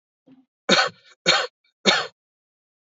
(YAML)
three_cough_length: 2.8 s
three_cough_amplitude: 26652
three_cough_signal_mean_std_ratio: 0.36
survey_phase: beta (2021-08-13 to 2022-03-07)
age: 18-44
gender: Male
wearing_mask: 'No'
symptom_none: true
smoker_status: Current smoker (1 to 10 cigarettes per day)
respiratory_condition_asthma: false
respiratory_condition_other: false
recruitment_source: REACT
submission_delay: 2 days
covid_test_result: Negative
covid_test_method: RT-qPCR
influenza_a_test_result: Unknown/Void
influenza_b_test_result: Unknown/Void